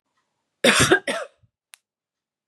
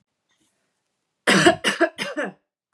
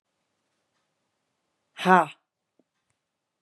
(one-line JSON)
{"cough_length": "2.5 s", "cough_amplitude": 29823, "cough_signal_mean_std_ratio": 0.33, "three_cough_length": "2.7 s", "three_cough_amplitude": 28049, "three_cough_signal_mean_std_ratio": 0.37, "exhalation_length": "3.4 s", "exhalation_amplitude": 25246, "exhalation_signal_mean_std_ratio": 0.17, "survey_phase": "beta (2021-08-13 to 2022-03-07)", "age": "18-44", "gender": "Female", "wearing_mask": "No", "symptom_none": true, "smoker_status": "Ex-smoker", "respiratory_condition_asthma": false, "respiratory_condition_other": false, "recruitment_source": "REACT", "submission_delay": "2 days", "covid_test_result": "Negative", "covid_test_method": "RT-qPCR", "influenza_a_test_result": "Negative", "influenza_b_test_result": "Negative"}